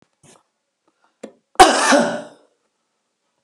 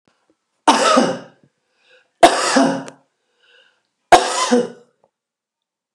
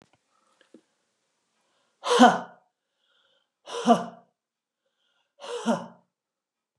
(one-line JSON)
{"cough_length": "3.4 s", "cough_amplitude": 32768, "cough_signal_mean_std_ratio": 0.3, "three_cough_length": "5.9 s", "three_cough_amplitude": 32768, "three_cough_signal_mean_std_ratio": 0.38, "exhalation_length": "6.8 s", "exhalation_amplitude": 24334, "exhalation_signal_mean_std_ratio": 0.24, "survey_phase": "beta (2021-08-13 to 2022-03-07)", "age": "45-64", "gender": "Female", "wearing_mask": "No", "symptom_none": true, "smoker_status": "Ex-smoker", "respiratory_condition_asthma": false, "respiratory_condition_other": false, "recruitment_source": "REACT", "submission_delay": "2 days", "covid_test_result": "Negative", "covid_test_method": "RT-qPCR", "covid_ct_value": 37.0, "covid_ct_gene": "N gene", "influenza_a_test_result": "Positive", "influenza_a_ct_value": 34.4, "influenza_b_test_result": "Positive", "influenza_b_ct_value": 33.8}